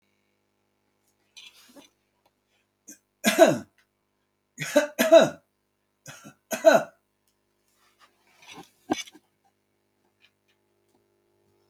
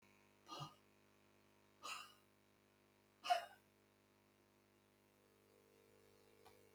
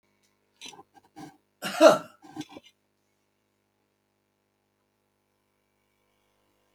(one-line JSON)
{"three_cough_length": "11.7 s", "three_cough_amplitude": 23009, "three_cough_signal_mean_std_ratio": 0.22, "exhalation_length": "6.7 s", "exhalation_amplitude": 1572, "exhalation_signal_mean_std_ratio": 0.26, "cough_length": "6.7 s", "cough_amplitude": 24799, "cough_signal_mean_std_ratio": 0.16, "survey_phase": "beta (2021-08-13 to 2022-03-07)", "age": "65+", "gender": "Male", "wearing_mask": "No", "symptom_runny_or_blocked_nose": true, "symptom_diarrhoea": true, "smoker_status": "Never smoked", "respiratory_condition_asthma": false, "respiratory_condition_other": false, "recruitment_source": "REACT", "submission_delay": "1 day", "covid_test_result": "Negative", "covid_test_method": "RT-qPCR", "influenza_a_test_result": "Negative", "influenza_b_test_result": "Negative"}